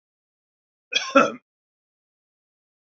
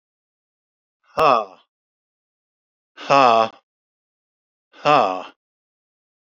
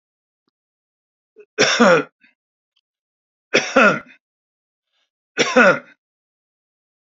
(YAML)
cough_length: 2.8 s
cough_amplitude: 25824
cough_signal_mean_std_ratio: 0.22
exhalation_length: 6.4 s
exhalation_amplitude: 30403
exhalation_signal_mean_std_ratio: 0.28
three_cough_length: 7.1 s
three_cough_amplitude: 27803
three_cough_signal_mean_std_ratio: 0.31
survey_phase: beta (2021-08-13 to 2022-03-07)
age: 65+
gender: Male
wearing_mask: 'No'
symptom_none: true
smoker_status: Never smoked
respiratory_condition_asthma: false
respiratory_condition_other: false
recruitment_source: REACT
submission_delay: 4 days
covid_test_result: Negative
covid_test_method: RT-qPCR
influenza_a_test_result: Negative
influenza_b_test_result: Negative